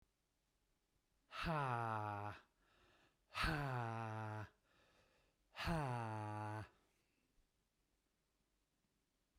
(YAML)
exhalation_length: 9.4 s
exhalation_amplitude: 1388
exhalation_signal_mean_std_ratio: 0.52
survey_phase: beta (2021-08-13 to 2022-03-07)
age: 45-64
gender: Male
wearing_mask: 'No'
symptom_none: true
smoker_status: Ex-smoker
respiratory_condition_asthma: false
respiratory_condition_other: false
recruitment_source: REACT
submission_delay: 1 day
covid_test_result: Negative
covid_test_method: RT-qPCR